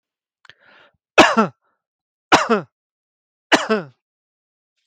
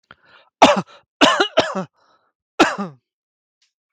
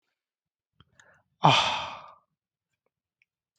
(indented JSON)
{
  "three_cough_length": "4.9 s",
  "three_cough_amplitude": 32768,
  "three_cough_signal_mean_std_ratio": 0.29,
  "cough_length": "3.9 s",
  "cough_amplitude": 32768,
  "cough_signal_mean_std_ratio": 0.34,
  "exhalation_length": "3.6 s",
  "exhalation_amplitude": 24435,
  "exhalation_signal_mean_std_ratio": 0.25,
  "survey_phase": "beta (2021-08-13 to 2022-03-07)",
  "age": "18-44",
  "gender": "Male",
  "wearing_mask": "No",
  "symptom_none": true,
  "smoker_status": "Never smoked",
  "respiratory_condition_asthma": false,
  "respiratory_condition_other": false,
  "recruitment_source": "REACT",
  "submission_delay": "0 days",
  "covid_test_result": "Positive",
  "covid_test_method": "RT-qPCR",
  "covid_ct_value": 26.0,
  "covid_ct_gene": "E gene",
  "influenza_a_test_result": "Negative",
  "influenza_b_test_result": "Negative"
}